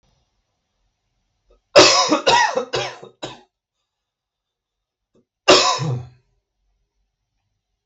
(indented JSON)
{
  "cough_length": "7.9 s",
  "cough_amplitude": 32768,
  "cough_signal_mean_std_ratio": 0.32,
  "survey_phase": "beta (2021-08-13 to 2022-03-07)",
  "age": "18-44",
  "gender": "Male",
  "wearing_mask": "No",
  "symptom_none": true,
  "smoker_status": "Never smoked",
  "respiratory_condition_asthma": false,
  "respiratory_condition_other": false,
  "recruitment_source": "REACT",
  "submission_delay": "0 days",
  "covid_test_result": "Negative",
  "covid_test_method": "RT-qPCR",
  "influenza_a_test_result": "Negative",
  "influenza_b_test_result": "Negative"
}